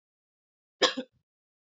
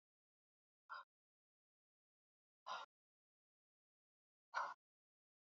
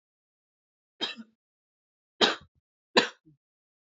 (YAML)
cough_length: 1.6 s
cough_amplitude: 16223
cough_signal_mean_std_ratio: 0.21
exhalation_length: 5.5 s
exhalation_amplitude: 927
exhalation_signal_mean_std_ratio: 0.22
three_cough_length: 3.9 s
three_cough_amplitude: 19807
three_cough_signal_mean_std_ratio: 0.21
survey_phase: beta (2021-08-13 to 2022-03-07)
age: 18-44
gender: Female
wearing_mask: 'No'
symptom_runny_or_blocked_nose: true
symptom_fatigue: true
symptom_fever_high_temperature: true
symptom_headache: true
symptom_onset: 3 days
smoker_status: Never smoked
respiratory_condition_asthma: false
respiratory_condition_other: false
recruitment_source: Test and Trace
submission_delay: 2 days
covid_test_result: Positive
covid_test_method: RT-qPCR
covid_ct_value: 32.7
covid_ct_gene: N gene